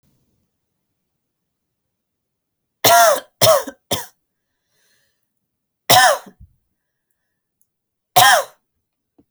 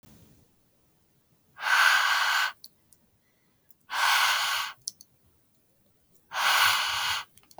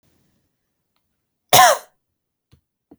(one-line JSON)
{"three_cough_length": "9.3 s", "three_cough_amplitude": 32768, "three_cough_signal_mean_std_ratio": 0.29, "exhalation_length": "7.6 s", "exhalation_amplitude": 14057, "exhalation_signal_mean_std_ratio": 0.5, "cough_length": "3.0 s", "cough_amplitude": 32768, "cough_signal_mean_std_ratio": 0.23, "survey_phase": "alpha (2021-03-01 to 2021-08-12)", "age": "18-44", "gender": "Female", "wearing_mask": "No", "symptom_none": true, "smoker_status": "Never smoked", "respiratory_condition_asthma": false, "respiratory_condition_other": false, "recruitment_source": "REACT", "submission_delay": "1 day", "covid_test_result": "Negative", "covid_test_method": "RT-qPCR"}